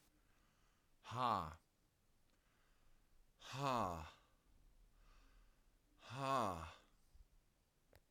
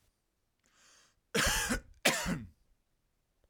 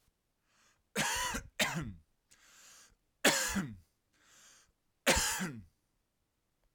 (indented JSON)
{
  "exhalation_length": "8.1 s",
  "exhalation_amplitude": 1552,
  "exhalation_signal_mean_std_ratio": 0.37,
  "cough_length": "3.5 s",
  "cough_amplitude": 9799,
  "cough_signal_mean_std_ratio": 0.39,
  "three_cough_length": "6.7 s",
  "three_cough_amplitude": 8879,
  "three_cough_signal_mean_std_ratio": 0.39,
  "survey_phase": "beta (2021-08-13 to 2022-03-07)",
  "age": "18-44",
  "gender": "Male",
  "wearing_mask": "No",
  "symptom_none": true,
  "smoker_status": "Never smoked",
  "respiratory_condition_asthma": false,
  "respiratory_condition_other": false,
  "recruitment_source": "REACT",
  "submission_delay": "2 days",
  "covid_test_result": "Negative",
  "covid_test_method": "RT-qPCR",
  "influenza_a_test_result": "Negative",
  "influenza_b_test_result": "Negative"
}